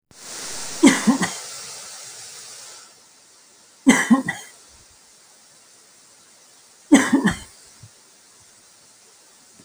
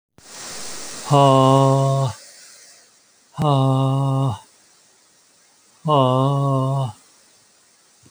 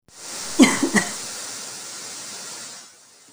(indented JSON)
{
  "three_cough_length": "9.6 s",
  "three_cough_amplitude": 30030,
  "three_cough_signal_mean_std_ratio": 0.33,
  "exhalation_length": "8.1 s",
  "exhalation_amplitude": 30082,
  "exhalation_signal_mean_std_ratio": 0.56,
  "cough_length": "3.3 s",
  "cough_amplitude": 31347,
  "cough_signal_mean_std_ratio": 0.45,
  "survey_phase": "beta (2021-08-13 to 2022-03-07)",
  "age": "45-64",
  "gender": "Male",
  "wearing_mask": "No",
  "symptom_runny_or_blocked_nose": true,
  "symptom_shortness_of_breath": true,
  "symptom_fatigue": true,
  "symptom_headache": true,
  "smoker_status": "Never smoked",
  "respiratory_condition_asthma": false,
  "respiratory_condition_other": false,
  "recruitment_source": "Test and Trace",
  "submission_delay": "2 days",
  "covid_test_result": "Positive",
  "covid_test_method": "RT-qPCR"
}